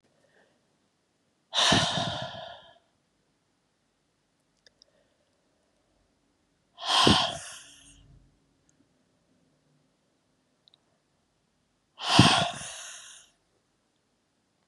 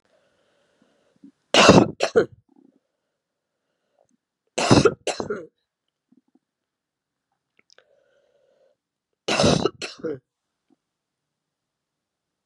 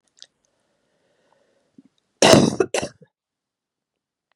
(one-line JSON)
{"exhalation_length": "14.7 s", "exhalation_amplitude": 27048, "exhalation_signal_mean_std_ratio": 0.27, "three_cough_length": "12.5 s", "three_cough_amplitude": 32767, "three_cough_signal_mean_std_ratio": 0.25, "cough_length": "4.4 s", "cough_amplitude": 32768, "cough_signal_mean_std_ratio": 0.24, "survey_phase": "beta (2021-08-13 to 2022-03-07)", "age": "65+", "gender": "Female", "wearing_mask": "No", "symptom_cough_any": true, "symptom_runny_or_blocked_nose": true, "symptom_sore_throat": true, "symptom_onset": "8 days", "smoker_status": "Ex-smoker", "respiratory_condition_asthma": false, "respiratory_condition_other": false, "recruitment_source": "REACT", "submission_delay": "1 day", "covid_test_result": "Negative", "covid_test_method": "RT-qPCR", "influenza_a_test_result": "Negative", "influenza_b_test_result": "Negative"}